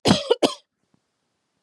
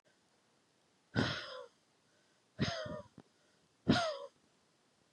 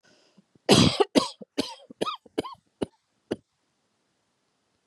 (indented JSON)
{
  "cough_length": "1.6 s",
  "cough_amplitude": 29434,
  "cough_signal_mean_std_ratio": 0.32,
  "exhalation_length": "5.1 s",
  "exhalation_amplitude": 5304,
  "exhalation_signal_mean_std_ratio": 0.34,
  "three_cough_length": "4.9 s",
  "three_cough_amplitude": 24144,
  "three_cough_signal_mean_std_ratio": 0.27,
  "survey_phase": "beta (2021-08-13 to 2022-03-07)",
  "age": "18-44",
  "gender": "Female",
  "wearing_mask": "No",
  "symptom_cough_any": true,
  "symptom_fatigue": true,
  "symptom_headache": true,
  "symptom_onset": "4 days",
  "smoker_status": "Never smoked",
  "respiratory_condition_asthma": false,
  "respiratory_condition_other": false,
  "recruitment_source": "Test and Trace",
  "submission_delay": "2 days",
  "covid_test_result": "Negative",
  "covid_test_method": "RT-qPCR"
}